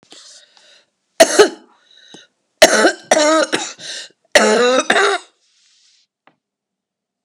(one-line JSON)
{"three_cough_length": "7.2 s", "three_cough_amplitude": 32768, "three_cough_signal_mean_std_ratio": 0.4, "survey_phase": "beta (2021-08-13 to 2022-03-07)", "age": "65+", "gender": "Male", "wearing_mask": "No", "symptom_fatigue": true, "smoker_status": "Never smoked", "respiratory_condition_asthma": false, "respiratory_condition_other": false, "recruitment_source": "Test and Trace", "submission_delay": "1 day", "covid_test_result": "Positive", "covid_test_method": "RT-qPCR", "covid_ct_value": 19.6, "covid_ct_gene": "ORF1ab gene", "covid_ct_mean": 20.2, "covid_viral_load": "240000 copies/ml", "covid_viral_load_category": "Low viral load (10K-1M copies/ml)"}